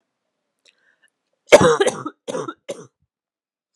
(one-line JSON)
{"cough_length": "3.8 s", "cough_amplitude": 32768, "cough_signal_mean_std_ratio": 0.26, "survey_phase": "alpha (2021-03-01 to 2021-08-12)", "age": "18-44", "gender": "Female", "wearing_mask": "No", "symptom_shortness_of_breath": true, "symptom_diarrhoea": true, "symptom_fatigue": true, "symptom_headache": true, "smoker_status": "Never smoked", "respiratory_condition_asthma": false, "respiratory_condition_other": false, "recruitment_source": "Test and Trace", "submission_delay": "1 day", "covid_test_result": "Positive", "covid_test_method": "ePCR"}